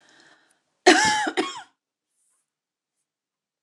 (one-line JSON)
{"cough_length": "3.6 s", "cough_amplitude": 29033, "cough_signal_mean_std_ratio": 0.29, "survey_phase": "beta (2021-08-13 to 2022-03-07)", "age": "45-64", "gender": "Female", "wearing_mask": "No", "symptom_cough_any": true, "symptom_fatigue": true, "symptom_onset": "5 days", "smoker_status": "Never smoked", "respiratory_condition_asthma": false, "respiratory_condition_other": false, "recruitment_source": "REACT", "submission_delay": "4 days", "covid_test_result": "Negative", "covid_test_method": "RT-qPCR", "influenza_a_test_result": "Negative", "influenza_b_test_result": "Negative"}